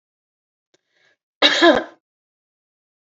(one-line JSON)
{"cough_length": "3.2 s", "cough_amplitude": 28909, "cough_signal_mean_std_ratio": 0.27, "survey_phase": "beta (2021-08-13 to 2022-03-07)", "age": "65+", "gender": "Female", "wearing_mask": "No", "symptom_runny_or_blocked_nose": true, "smoker_status": "Ex-smoker", "respiratory_condition_asthma": false, "respiratory_condition_other": false, "recruitment_source": "Test and Trace", "submission_delay": "2 days", "covid_test_result": "Positive", "covid_test_method": "ePCR"}